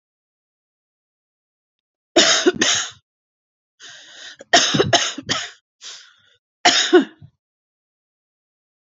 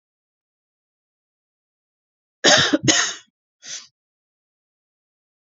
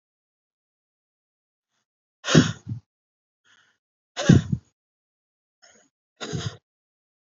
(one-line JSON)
{"three_cough_length": "9.0 s", "three_cough_amplitude": 31522, "three_cough_signal_mean_std_ratio": 0.34, "cough_length": "5.5 s", "cough_amplitude": 32768, "cough_signal_mean_std_ratio": 0.26, "exhalation_length": "7.3 s", "exhalation_amplitude": 27829, "exhalation_signal_mean_std_ratio": 0.21, "survey_phase": "alpha (2021-03-01 to 2021-08-12)", "age": "45-64", "gender": "Female", "wearing_mask": "No", "symptom_none": true, "smoker_status": "Never smoked", "respiratory_condition_asthma": false, "respiratory_condition_other": false, "recruitment_source": "REACT", "submission_delay": "33 days", "covid_test_method": "RT-qPCR"}